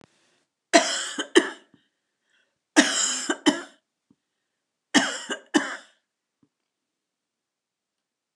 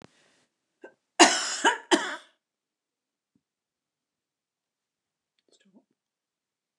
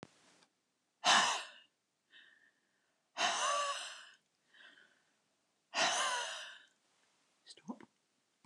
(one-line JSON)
{"three_cough_length": "8.4 s", "three_cough_amplitude": 27667, "three_cough_signal_mean_std_ratio": 0.3, "cough_length": "6.8 s", "cough_amplitude": 27975, "cough_signal_mean_std_ratio": 0.21, "exhalation_length": "8.5 s", "exhalation_amplitude": 5290, "exhalation_signal_mean_std_ratio": 0.37, "survey_phase": "beta (2021-08-13 to 2022-03-07)", "age": "65+", "gender": "Female", "wearing_mask": "No", "symptom_none": true, "smoker_status": "Never smoked", "respiratory_condition_asthma": false, "respiratory_condition_other": false, "recruitment_source": "REACT", "submission_delay": "2 days", "covid_test_result": "Negative", "covid_test_method": "RT-qPCR"}